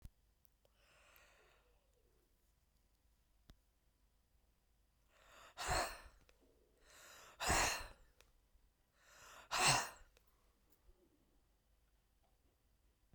{"exhalation_length": "13.1 s", "exhalation_amplitude": 2961, "exhalation_signal_mean_std_ratio": 0.27, "survey_phase": "beta (2021-08-13 to 2022-03-07)", "age": "65+", "gender": "Female", "wearing_mask": "No", "symptom_none": true, "smoker_status": "Never smoked", "respiratory_condition_asthma": false, "respiratory_condition_other": false, "recruitment_source": "REACT", "submission_delay": "1 day", "covid_test_result": "Negative", "covid_test_method": "RT-qPCR", "influenza_a_test_result": "Negative", "influenza_b_test_result": "Negative"}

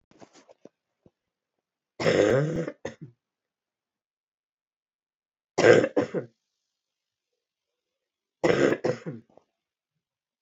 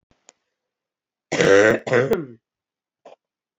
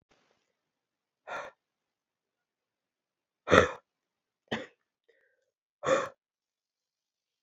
{"three_cough_length": "10.4 s", "three_cough_amplitude": 20323, "three_cough_signal_mean_std_ratio": 0.29, "cough_length": "3.6 s", "cough_amplitude": 25443, "cough_signal_mean_std_ratio": 0.37, "exhalation_length": "7.4 s", "exhalation_amplitude": 26100, "exhalation_signal_mean_std_ratio": 0.19, "survey_phase": "beta (2021-08-13 to 2022-03-07)", "age": "18-44", "gender": "Female", "wearing_mask": "No", "symptom_runny_or_blocked_nose": true, "symptom_shortness_of_breath": true, "symptom_fatigue": true, "symptom_change_to_sense_of_smell_or_taste": true, "smoker_status": "Never smoked", "respiratory_condition_asthma": true, "respiratory_condition_other": false, "recruitment_source": "Test and Trace", "submission_delay": "2 days", "covid_test_result": "Positive", "covid_test_method": "RT-qPCR", "covid_ct_value": 17.3, "covid_ct_gene": "ORF1ab gene", "covid_ct_mean": 17.5, "covid_viral_load": "1800000 copies/ml", "covid_viral_load_category": "High viral load (>1M copies/ml)"}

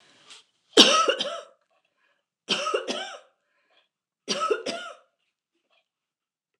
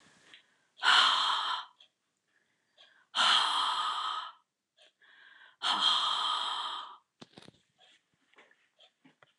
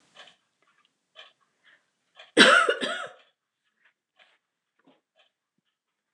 {"three_cough_length": "6.6 s", "three_cough_amplitude": 29203, "three_cough_signal_mean_std_ratio": 0.32, "exhalation_length": "9.4 s", "exhalation_amplitude": 8787, "exhalation_signal_mean_std_ratio": 0.47, "cough_length": "6.1 s", "cough_amplitude": 28325, "cough_signal_mean_std_ratio": 0.22, "survey_phase": "alpha (2021-03-01 to 2021-08-12)", "age": "65+", "gender": "Female", "wearing_mask": "No", "symptom_none": true, "smoker_status": "Never smoked", "respiratory_condition_asthma": false, "respiratory_condition_other": false, "recruitment_source": "REACT", "submission_delay": "1 day", "covid_test_result": "Negative", "covid_test_method": "RT-qPCR"}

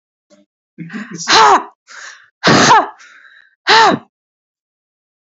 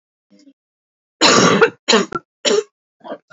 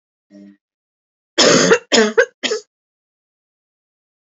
{"exhalation_length": "5.2 s", "exhalation_amplitude": 32768, "exhalation_signal_mean_std_ratio": 0.42, "three_cough_length": "3.3 s", "three_cough_amplitude": 32768, "three_cough_signal_mean_std_ratio": 0.43, "cough_length": "4.3 s", "cough_amplitude": 32768, "cough_signal_mean_std_ratio": 0.35, "survey_phase": "beta (2021-08-13 to 2022-03-07)", "age": "18-44", "gender": "Female", "wearing_mask": "No", "symptom_runny_or_blocked_nose": true, "symptom_change_to_sense_of_smell_or_taste": true, "symptom_loss_of_taste": true, "symptom_onset": "12 days", "smoker_status": "Never smoked", "respiratory_condition_asthma": false, "respiratory_condition_other": false, "recruitment_source": "REACT", "submission_delay": "2 days", "covid_test_result": "Negative", "covid_test_method": "RT-qPCR", "influenza_a_test_result": "Negative", "influenza_b_test_result": "Negative"}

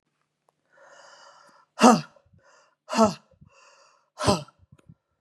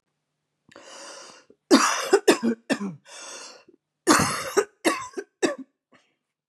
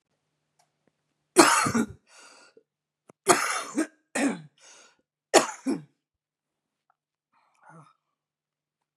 {"exhalation_length": "5.2 s", "exhalation_amplitude": 29585, "exhalation_signal_mean_std_ratio": 0.24, "cough_length": "6.5 s", "cough_amplitude": 27420, "cough_signal_mean_std_ratio": 0.39, "three_cough_length": "9.0 s", "three_cough_amplitude": 30822, "three_cough_signal_mean_std_ratio": 0.28, "survey_phase": "beta (2021-08-13 to 2022-03-07)", "age": "45-64", "gender": "Female", "wearing_mask": "No", "symptom_cough_any": true, "symptom_runny_or_blocked_nose": true, "symptom_fatigue": true, "symptom_headache": true, "symptom_onset": "2 days", "smoker_status": "Ex-smoker", "respiratory_condition_asthma": false, "respiratory_condition_other": false, "recruitment_source": "Test and Trace", "submission_delay": "1 day", "covid_test_result": "Positive", "covid_test_method": "RT-qPCR", "covid_ct_value": 31.9, "covid_ct_gene": "ORF1ab gene"}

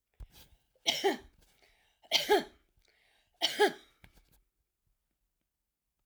{"three_cough_length": "6.1 s", "three_cough_amplitude": 8580, "three_cough_signal_mean_std_ratio": 0.28, "survey_phase": "alpha (2021-03-01 to 2021-08-12)", "age": "65+", "gender": "Female", "wearing_mask": "No", "symptom_none": true, "smoker_status": "Never smoked", "respiratory_condition_asthma": true, "respiratory_condition_other": false, "recruitment_source": "REACT", "submission_delay": "1 day", "covid_test_result": "Negative", "covid_test_method": "RT-qPCR"}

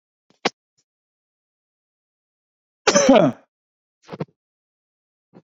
{"cough_length": "5.5 s", "cough_amplitude": 29873, "cough_signal_mean_std_ratio": 0.23, "survey_phase": "beta (2021-08-13 to 2022-03-07)", "age": "45-64", "gender": "Male", "wearing_mask": "No", "symptom_none": true, "smoker_status": "Never smoked", "respiratory_condition_asthma": false, "respiratory_condition_other": false, "recruitment_source": "REACT", "submission_delay": "2 days", "covid_test_result": "Negative", "covid_test_method": "RT-qPCR"}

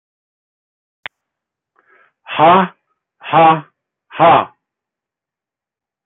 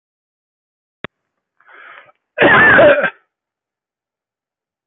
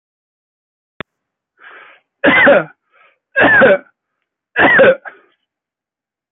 {"exhalation_length": "6.1 s", "exhalation_amplitude": 31901, "exhalation_signal_mean_std_ratio": 0.32, "cough_length": "4.9 s", "cough_amplitude": 29888, "cough_signal_mean_std_ratio": 0.34, "three_cough_length": "6.3 s", "three_cough_amplitude": 30403, "three_cough_signal_mean_std_ratio": 0.4, "survey_phase": "alpha (2021-03-01 to 2021-08-12)", "age": "45-64", "gender": "Male", "wearing_mask": "No", "symptom_none": true, "smoker_status": "Never smoked", "respiratory_condition_asthma": true, "respiratory_condition_other": false, "recruitment_source": "REACT", "submission_delay": "2 days", "covid_test_result": "Negative", "covid_test_method": "RT-qPCR"}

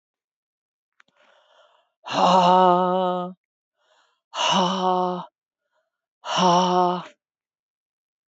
{"exhalation_length": "8.3 s", "exhalation_amplitude": 19530, "exhalation_signal_mean_std_ratio": 0.44, "survey_phase": "beta (2021-08-13 to 2022-03-07)", "age": "65+", "gender": "Female", "wearing_mask": "No", "symptom_cough_any": true, "symptom_runny_or_blocked_nose": true, "symptom_sore_throat": true, "symptom_fatigue": true, "symptom_headache": true, "symptom_other": true, "symptom_onset": "3 days", "smoker_status": "Never smoked", "respiratory_condition_asthma": false, "respiratory_condition_other": false, "recruitment_source": "Test and Trace", "submission_delay": "2 days", "covid_test_result": "Positive", "covid_test_method": "RT-qPCR", "covid_ct_value": 18.5, "covid_ct_gene": "ORF1ab gene"}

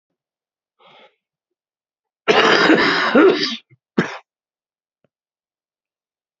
{"cough_length": "6.4 s", "cough_amplitude": 31806, "cough_signal_mean_std_ratio": 0.36, "survey_phase": "beta (2021-08-13 to 2022-03-07)", "age": "65+", "gender": "Male", "wearing_mask": "No", "symptom_cough_any": true, "symptom_runny_or_blocked_nose": true, "symptom_fatigue": true, "symptom_change_to_sense_of_smell_or_taste": true, "symptom_onset": "4 days", "smoker_status": "Never smoked", "respiratory_condition_asthma": false, "respiratory_condition_other": true, "recruitment_source": "Test and Trace", "submission_delay": "2 days", "covid_test_result": "Positive", "covid_test_method": "RT-qPCR", "covid_ct_value": 24.6, "covid_ct_gene": "N gene"}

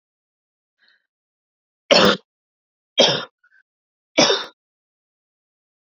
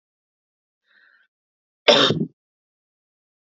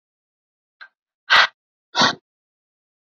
{"three_cough_length": "5.8 s", "three_cough_amplitude": 32557, "three_cough_signal_mean_std_ratio": 0.27, "cough_length": "3.4 s", "cough_amplitude": 29350, "cough_signal_mean_std_ratio": 0.24, "exhalation_length": "3.2 s", "exhalation_amplitude": 29721, "exhalation_signal_mean_std_ratio": 0.25, "survey_phase": "beta (2021-08-13 to 2022-03-07)", "age": "18-44", "gender": "Female", "wearing_mask": "No", "symptom_cough_any": true, "symptom_runny_or_blocked_nose": true, "symptom_sore_throat": true, "symptom_onset": "13 days", "smoker_status": "Never smoked", "respiratory_condition_asthma": false, "respiratory_condition_other": false, "recruitment_source": "REACT", "submission_delay": "8 days", "covid_test_result": "Positive", "covid_test_method": "RT-qPCR", "covid_ct_value": 19.0, "covid_ct_gene": "E gene", "influenza_a_test_result": "Negative", "influenza_b_test_result": "Negative"}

